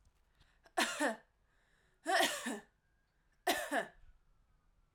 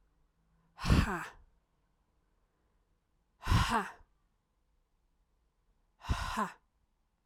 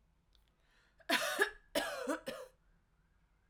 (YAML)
three_cough_length: 4.9 s
three_cough_amplitude: 4580
three_cough_signal_mean_std_ratio: 0.4
exhalation_length: 7.3 s
exhalation_amplitude: 7644
exhalation_signal_mean_std_ratio: 0.31
cough_length: 3.5 s
cough_amplitude: 5423
cough_signal_mean_std_ratio: 0.4
survey_phase: alpha (2021-03-01 to 2021-08-12)
age: 18-44
gender: Female
wearing_mask: 'No'
symptom_shortness_of_breath: true
symptom_fatigue: true
symptom_change_to_sense_of_smell_or_taste: true
symptom_loss_of_taste: true
symptom_onset: 3 days
smoker_status: Never smoked
respiratory_condition_asthma: false
respiratory_condition_other: false
recruitment_source: Test and Trace
submission_delay: 2 days
covid_test_result: Positive
covid_test_method: RT-qPCR
covid_ct_value: 18.1
covid_ct_gene: ORF1ab gene
covid_ct_mean: 19.8
covid_viral_load: 330000 copies/ml
covid_viral_load_category: Low viral load (10K-1M copies/ml)